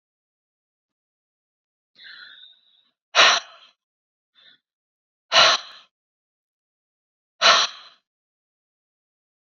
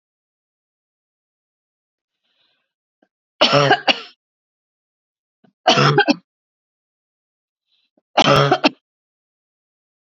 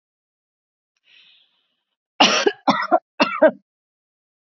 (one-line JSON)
{"exhalation_length": "9.6 s", "exhalation_amplitude": 27962, "exhalation_signal_mean_std_ratio": 0.23, "three_cough_length": "10.1 s", "three_cough_amplitude": 30455, "three_cough_signal_mean_std_ratio": 0.28, "cough_length": "4.4 s", "cough_amplitude": 30234, "cough_signal_mean_std_ratio": 0.31, "survey_phase": "beta (2021-08-13 to 2022-03-07)", "age": "45-64", "gender": "Female", "wearing_mask": "No", "symptom_none": true, "smoker_status": "Never smoked", "respiratory_condition_asthma": false, "respiratory_condition_other": false, "recruitment_source": "REACT", "submission_delay": "2 days", "covid_test_result": "Negative", "covid_test_method": "RT-qPCR", "influenza_a_test_result": "Negative", "influenza_b_test_result": "Negative"}